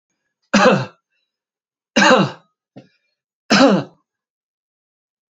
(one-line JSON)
{"cough_length": "5.3 s", "cough_amplitude": 30126, "cough_signal_mean_std_ratio": 0.35, "survey_phase": "alpha (2021-03-01 to 2021-08-12)", "age": "65+", "gender": "Male", "wearing_mask": "No", "symptom_none": true, "smoker_status": "Never smoked", "respiratory_condition_asthma": false, "respiratory_condition_other": false, "recruitment_source": "REACT", "submission_delay": "2 days", "covid_test_result": "Negative", "covid_test_method": "RT-qPCR"}